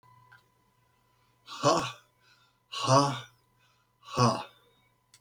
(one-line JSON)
{"exhalation_length": "5.2 s", "exhalation_amplitude": 13699, "exhalation_signal_mean_std_ratio": 0.34, "survey_phase": "beta (2021-08-13 to 2022-03-07)", "age": "65+", "gender": "Male", "wearing_mask": "No", "symptom_none": true, "smoker_status": "Never smoked", "respiratory_condition_asthma": false, "respiratory_condition_other": false, "recruitment_source": "REACT", "submission_delay": "3 days", "covid_test_result": "Negative", "covid_test_method": "RT-qPCR"}